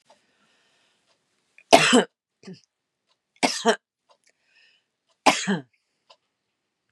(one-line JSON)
{"three_cough_length": "6.9 s", "three_cough_amplitude": 32767, "three_cough_signal_mean_std_ratio": 0.24, "survey_phase": "beta (2021-08-13 to 2022-03-07)", "age": "45-64", "gender": "Female", "wearing_mask": "No", "symptom_none": true, "smoker_status": "Never smoked", "respiratory_condition_asthma": false, "respiratory_condition_other": false, "recruitment_source": "REACT", "submission_delay": "4 days", "covid_test_result": "Negative", "covid_test_method": "RT-qPCR", "influenza_a_test_result": "Negative", "influenza_b_test_result": "Negative"}